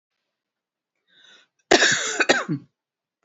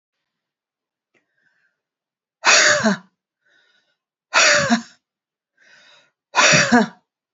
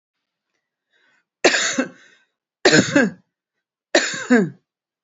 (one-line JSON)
{"cough_length": "3.2 s", "cough_amplitude": 29978, "cough_signal_mean_std_ratio": 0.34, "exhalation_length": "7.3 s", "exhalation_amplitude": 31043, "exhalation_signal_mean_std_ratio": 0.36, "three_cough_length": "5.0 s", "three_cough_amplitude": 32278, "three_cough_signal_mean_std_ratio": 0.37, "survey_phase": "beta (2021-08-13 to 2022-03-07)", "age": "45-64", "gender": "Female", "wearing_mask": "No", "symptom_shortness_of_breath": true, "smoker_status": "Never smoked", "respiratory_condition_asthma": false, "respiratory_condition_other": false, "recruitment_source": "Test and Trace", "submission_delay": "1 day", "covid_test_result": "Positive", "covid_test_method": "RT-qPCR", "covid_ct_value": 23.8, "covid_ct_gene": "ORF1ab gene", "covid_ct_mean": 24.3, "covid_viral_load": "11000 copies/ml", "covid_viral_load_category": "Low viral load (10K-1M copies/ml)"}